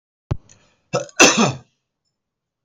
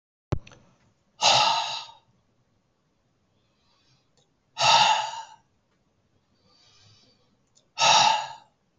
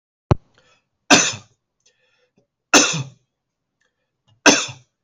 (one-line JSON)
{"cough_length": "2.6 s", "cough_amplitude": 32768, "cough_signal_mean_std_ratio": 0.31, "exhalation_length": "8.8 s", "exhalation_amplitude": 17390, "exhalation_signal_mean_std_ratio": 0.35, "three_cough_length": "5.0 s", "three_cough_amplitude": 32768, "three_cough_signal_mean_std_ratio": 0.27, "survey_phase": "beta (2021-08-13 to 2022-03-07)", "age": "45-64", "gender": "Male", "wearing_mask": "No", "symptom_none": true, "smoker_status": "Ex-smoker", "respiratory_condition_asthma": false, "respiratory_condition_other": false, "recruitment_source": "REACT", "submission_delay": "1 day", "covid_test_result": "Negative", "covid_test_method": "RT-qPCR", "influenza_a_test_result": "Negative", "influenza_b_test_result": "Negative"}